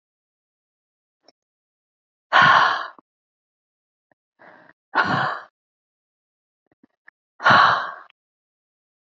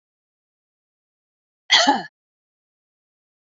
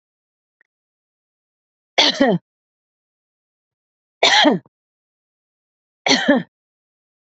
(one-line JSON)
{"exhalation_length": "9.0 s", "exhalation_amplitude": 27510, "exhalation_signal_mean_std_ratio": 0.29, "cough_length": "3.5 s", "cough_amplitude": 26026, "cough_signal_mean_std_ratio": 0.22, "three_cough_length": "7.3 s", "three_cough_amplitude": 29479, "three_cough_signal_mean_std_ratio": 0.29, "survey_phase": "beta (2021-08-13 to 2022-03-07)", "age": "45-64", "gender": "Female", "wearing_mask": "No", "symptom_none": true, "smoker_status": "Ex-smoker", "respiratory_condition_asthma": false, "respiratory_condition_other": false, "recruitment_source": "REACT", "submission_delay": "1 day", "covid_test_result": "Negative", "covid_test_method": "RT-qPCR", "influenza_a_test_result": "Negative", "influenza_b_test_result": "Negative"}